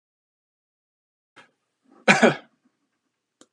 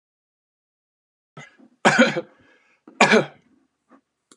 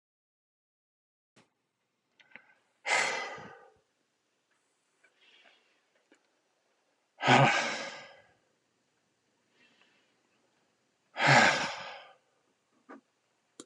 {"cough_length": "3.5 s", "cough_amplitude": 30781, "cough_signal_mean_std_ratio": 0.19, "three_cough_length": "4.4 s", "three_cough_amplitude": 30450, "three_cough_signal_mean_std_ratio": 0.27, "exhalation_length": "13.7 s", "exhalation_amplitude": 10802, "exhalation_signal_mean_std_ratio": 0.26, "survey_phase": "beta (2021-08-13 to 2022-03-07)", "age": "65+", "gender": "Male", "wearing_mask": "No", "symptom_none": true, "smoker_status": "Ex-smoker", "respiratory_condition_asthma": false, "respiratory_condition_other": false, "recruitment_source": "REACT", "submission_delay": "19 days", "covid_test_result": "Negative", "covid_test_method": "RT-qPCR"}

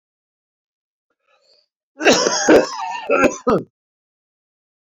{"cough_length": "4.9 s", "cough_amplitude": 28145, "cough_signal_mean_std_ratio": 0.38, "survey_phase": "beta (2021-08-13 to 2022-03-07)", "age": "45-64", "gender": "Male", "wearing_mask": "No", "symptom_cough_any": true, "symptom_fatigue": true, "symptom_headache": true, "symptom_change_to_sense_of_smell_or_taste": true, "symptom_loss_of_taste": true, "smoker_status": "Never smoked", "respiratory_condition_asthma": false, "respiratory_condition_other": false, "recruitment_source": "Test and Trace", "submission_delay": "2 days", "covid_test_result": "Positive", "covid_test_method": "RT-qPCR", "covid_ct_value": 24.8, "covid_ct_gene": "ORF1ab gene", "covid_ct_mean": 25.5, "covid_viral_load": "4300 copies/ml", "covid_viral_load_category": "Minimal viral load (< 10K copies/ml)"}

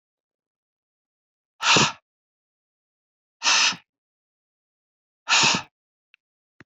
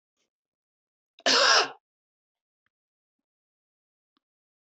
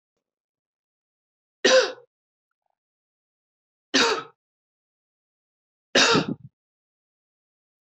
{"exhalation_length": "6.7 s", "exhalation_amplitude": 18662, "exhalation_signal_mean_std_ratio": 0.29, "cough_length": "4.8 s", "cough_amplitude": 14429, "cough_signal_mean_std_ratio": 0.24, "three_cough_length": "7.9 s", "three_cough_amplitude": 18650, "three_cough_signal_mean_std_ratio": 0.26, "survey_phase": "beta (2021-08-13 to 2022-03-07)", "age": "45-64", "gender": "Female", "wearing_mask": "No", "symptom_none": true, "smoker_status": "Never smoked", "respiratory_condition_asthma": false, "respiratory_condition_other": false, "recruitment_source": "REACT", "submission_delay": "2 days", "covid_test_result": "Negative", "covid_test_method": "RT-qPCR", "influenza_a_test_result": "Negative", "influenza_b_test_result": "Negative"}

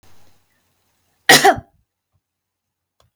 {"cough_length": "3.2 s", "cough_amplitude": 32768, "cough_signal_mean_std_ratio": 0.23, "survey_phase": "beta (2021-08-13 to 2022-03-07)", "age": "65+", "gender": "Female", "wearing_mask": "No", "symptom_none": true, "smoker_status": "Ex-smoker", "respiratory_condition_asthma": false, "respiratory_condition_other": false, "recruitment_source": "REACT", "submission_delay": "1 day", "covid_test_result": "Negative", "covid_test_method": "RT-qPCR"}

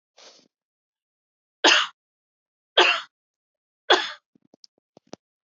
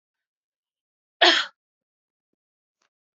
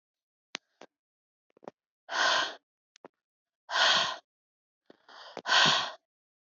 {"three_cough_length": "5.5 s", "three_cough_amplitude": 24271, "three_cough_signal_mean_std_ratio": 0.25, "cough_length": "3.2 s", "cough_amplitude": 23699, "cough_signal_mean_std_ratio": 0.2, "exhalation_length": "6.6 s", "exhalation_amplitude": 11021, "exhalation_signal_mean_std_ratio": 0.35, "survey_phase": "alpha (2021-03-01 to 2021-08-12)", "age": "45-64", "gender": "Female", "wearing_mask": "No", "symptom_none": true, "smoker_status": "Never smoked", "respiratory_condition_asthma": false, "respiratory_condition_other": false, "recruitment_source": "REACT", "submission_delay": "2 days", "covid_test_result": "Negative", "covid_test_method": "RT-qPCR"}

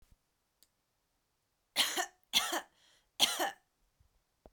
{"three_cough_length": "4.5 s", "three_cough_amplitude": 8689, "three_cough_signal_mean_std_ratio": 0.32, "survey_phase": "beta (2021-08-13 to 2022-03-07)", "age": "45-64", "gender": "Female", "wearing_mask": "No", "symptom_none": true, "smoker_status": "Ex-smoker", "respiratory_condition_asthma": false, "respiratory_condition_other": false, "recruitment_source": "REACT", "submission_delay": "2 days", "covid_test_result": "Negative", "covid_test_method": "RT-qPCR"}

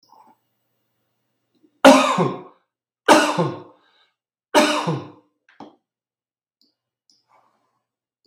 {"three_cough_length": "8.3 s", "three_cough_amplitude": 32768, "three_cough_signal_mean_std_ratio": 0.29, "survey_phase": "beta (2021-08-13 to 2022-03-07)", "age": "45-64", "gender": "Male", "wearing_mask": "No", "symptom_none": true, "smoker_status": "Never smoked", "respiratory_condition_asthma": false, "respiratory_condition_other": false, "recruitment_source": "REACT", "submission_delay": "0 days", "covid_test_result": "Negative", "covid_test_method": "RT-qPCR", "influenza_a_test_result": "Negative", "influenza_b_test_result": "Negative"}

